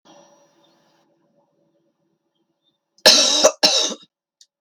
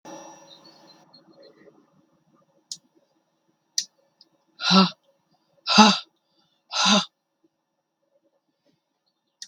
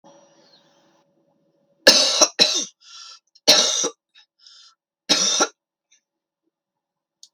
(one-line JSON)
{"cough_length": "4.6 s", "cough_amplitude": 32768, "cough_signal_mean_std_ratio": 0.3, "exhalation_length": "9.5 s", "exhalation_amplitude": 32768, "exhalation_signal_mean_std_ratio": 0.24, "three_cough_length": "7.3 s", "three_cough_amplitude": 32768, "three_cough_signal_mean_std_ratio": 0.33, "survey_phase": "beta (2021-08-13 to 2022-03-07)", "age": "65+", "gender": "Female", "wearing_mask": "No", "symptom_runny_or_blocked_nose": true, "smoker_status": "Never smoked", "respiratory_condition_asthma": false, "respiratory_condition_other": false, "recruitment_source": "REACT", "submission_delay": "3 days", "covid_test_result": "Negative", "covid_test_method": "RT-qPCR"}